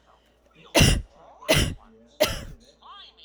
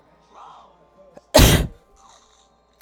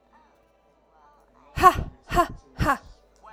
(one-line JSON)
{"three_cough_length": "3.2 s", "three_cough_amplitude": 23237, "three_cough_signal_mean_std_ratio": 0.38, "cough_length": "2.8 s", "cough_amplitude": 32768, "cough_signal_mean_std_ratio": 0.28, "exhalation_length": "3.3 s", "exhalation_amplitude": 27536, "exhalation_signal_mean_std_ratio": 0.3, "survey_phase": "alpha (2021-03-01 to 2021-08-12)", "age": "18-44", "gender": "Female", "wearing_mask": "No", "symptom_none": true, "smoker_status": "Never smoked", "respiratory_condition_asthma": false, "respiratory_condition_other": false, "recruitment_source": "REACT", "submission_delay": "2 days", "covid_test_result": "Negative", "covid_test_method": "RT-qPCR"}